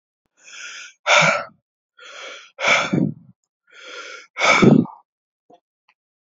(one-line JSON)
{"exhalation_length": "6.2 s", "exhalation_amplitude": 29335, "exhalation_signal_mean_std_ratio": 0.38, "survey_phase": "alpha (2021-03-01 to 2021-08-12)", "age": "18-44", "gender": "Male", "wearing_mask": "No", "symptom_fatigue": true, "symptom_fever_high_temperature": true, "smoker_status": "Current smoker (1 to 10 cigarettes per day)", "respiratory_condition_asthma": false, "respiratory_condition_other": false, "recruitment_source": "Test and Trace", "submission_delay": "1 day", "covid_test_result": "Positive", "covid_test_method": "RT-qPCR", "covid_ct_value": 22.5, "covid_ct_gene": "ORF1ab gene"}